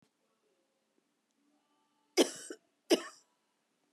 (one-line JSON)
{"cough_length": "3.9 s", "cough_amplitude": 7637, "cough_signal_mean_std_ratio": 0.19, "survey_phase": "beta (2021-08-13 to 2022-03-07)", "age": "45-64", "gender": "Female", "wearing_mask": "No", "symptom_none": true, "smoker_status": "Never smoked", "respiratory_condition_asthma": false, "respiratory_condition_other": false, "recruitment_source": "REACT", "submission_delay": "1 day", "covid_test_result": "Negative", "covid_test_method": "RT-qPCR", "influenza_a_test_result": "Negative", "influenza_b_test_result": "Negative"}